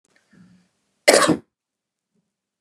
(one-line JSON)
{"cough_length": "2.6 s", "cough_amplitude": 32768, "cough_signal_mean_std_ratio": 0.25, "survey_phase": "beta (2021-08-13 to 2022-03-07)", "age": "45-64", "gender": "Male", "wearing_mask": "No", "symptom_none": true, "smoker_status": "Ex-smoker", "respiratory_condition_asthma": false, "respiratory_condition_other": false, "recruitment_source": "REACT", "submission_delay": "3 days", "covid_test_result": "Negative", "covid_test_method": "RT-qPCR", "influenza_a_test_result": "Negative", "influenza_b_test_result": "Negative"}